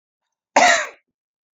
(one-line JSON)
{"cough_length": "1.5 s", "cough_amplitude": 28530, "cough_signal_mean_std_ratio": 0.35, "survey_phase": "beta (2021-08-13 to 2022-03-07)", "age": "18-44", "gender": "Female", "wearing_mask": "No", "symptom_none": true, "symptom_onset": "3 days", "smoker_status": "Never smoked", "respiratory_condition_asthma": false, "respiratory_condition_other": false, "recruitment_source": "REACT", "submission_delay": "1 day", "covid_test_result": "Negative", "covid_test_method": "RT-qPCR"}